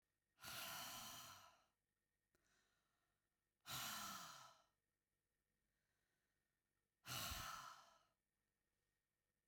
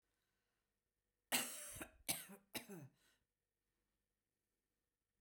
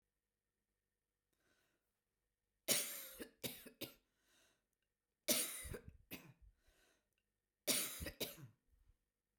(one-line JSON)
{"exhalation_length": "9.5 s", "exhalation_amplitude": 431, "exhalation_signal_mean_std_ratio": 0.44, "cough_length": "5.2 s", "cough_amplitude": 1872, "cough_signal_mean_std_ratio": 0.28, "three_cough_length": "9.4 s", "three_cough_amplitude": 2776, "three_cough_signal_mean_std_ratio": 0.31, "survey_phase": "beta (2021-08-13 to 2022-03-07)", "age": "65+", "gender": "Female", "wearing_mask": "No", "symptom_none": true, "smoker_status": "Ex-smoker", "respiratory_condition_asthma": false, "respiratory_condition_other": false, "recruitment_source": "Test and Trace", "submission_delay": "2 days", "covid_test_result": "Positive", "covid_test_method": "ePCR"}